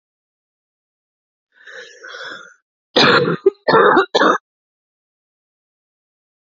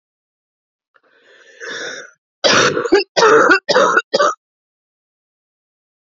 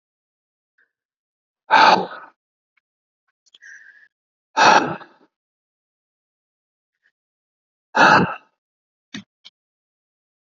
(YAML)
cough_length: 6.5 s
cough_amplitude: 30480
cough_signal_mean_std_ratio: 0.34
three_cough_length: 6.1 s
three_cough_amplitude: 32293
three_cough_signal_mean_std_ratio: 0.42
exhalation_length: 10.4 s
exhalation_amplitude: 32767
exhalation_signal_mean_std_ratio: 0.25
survey_phase: alpha (2021-03-01 to 2021-08-12)
age: 18-44
gender: Female
wearing_mask: 'No'
symptom_cough_any: true
symptom_new_continuous_cough: true
symptom_shortness_of_breath: true
symptom_fatigue: true
symptom_fever_high_temperature: true
symptom_headache: true
symptom_onset: 3 days
smoker_status: Never smoked
respiratory_condition_asthma: false
respiratory_condition_other: false
recruitment_source: Test and Trace
submission_delay: 2 days
covid_test_result: Positive
covid_test_method: RT-qPCR
covid_ct_value: 15.5
covid_ct_gene: ORF1ab gene